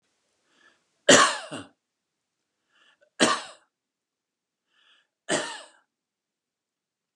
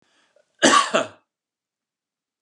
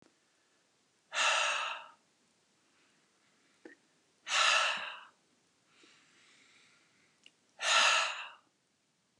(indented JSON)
{
  "three_cough_length": "7.2 s",
  "three_cough_amplitude": 29502,
  "three_cough_signal_mean_std_ratio": 0.22,
  "cough_length": "2.4 s",
  "cough_amplitude": 28931,
  "cough_signal_mean_std_ratio": 0.3,
  "exhalation_length": "9.2 s",
  "exhalation_amplitude": 5958,
  "exhalation_signal_mean_std_ratio": 0.36,
  "survey_phase": "beta (2021-08-13 to 2022-03-07)",
  "age": "45-64",
  "gender": "Male",
  "wearing_mask": "No",
  "symptom_none": true,
  "smoker_status": "Never smoked",
  "respiratory_condition_asthma": false,
  "respiratory_condition_other": false,
  "recruitment_source": "REACT",
  "submission_delay": "3 days",
  "covid_test_result": "Negative",
  "covid_test_method": "RT-qPCR",
  "influenza_a_test_result": "Negative",
  "influenza_b_test_result": "Negative"
}